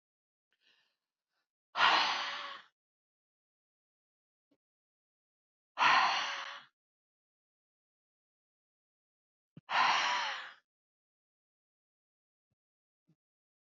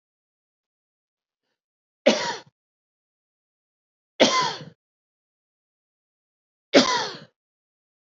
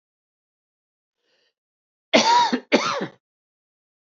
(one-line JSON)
{"exhalation_length": "13.7 s", "exhalation_amplitude": 6868, "exhalation_signal_mean_std_ratio": 0.29, "three_cough_length": "8.2 s", "three_cough_amplitude": 27052, "three_cough_signal_mean_std_ratio": 0.24, "cough_length": "4.1 s", "cough_amplitude": 25905, "cough_signal_mean_std_ratio": 0.33, "survey_phase": "alpha (2021-03-01 to 2021-08-12)", "age": "45-64", "gender": "Male", "wearing_mask": "No", "symptom_none": true, "smoker_status": "Never smoked", "respiratory_condition_asthma": true, "respiratory_condition_other": false, "recruitment_source": "REACT", "covid_test_method": "RT-qPCR"}